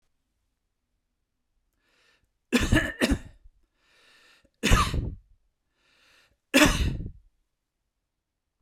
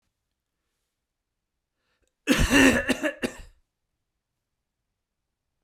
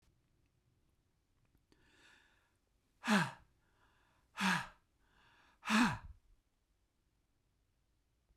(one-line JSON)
{"three_cough_length": "8.6 s", "three_cough_amplitude": 23020, "three_cough_signal_mean_std_ratio": 0.31, "cough_length": "5.6 s", "cough_amplitude": 19693, "cough_signal_mean_std_ratio": 0.29, "exhalation_length": "8.4 s", "exhalation_amplitude": 3727, "exhalation_signal_mean_std_ratio": 0.26, "survey_phase": "beta (2021-08-13 to 2022-03-07)", "age": "65+", "gender": "Male", "wearing_mask": "No", "symptom_runny_or_blocked_nose": true, "symptom_headache": true, "smoker_status": "Ex-smoker", "respiratory_condition_asthma": false, "respiratory_condition_other": false, "recruitment_source": "REACT", "submission_delay": "2 days", "covid_test_result": "Negative", "covid_test_method": "RT-qPCR", "influenza_a_test_result": "Negative", "influenza_b_test_result": "Negative"}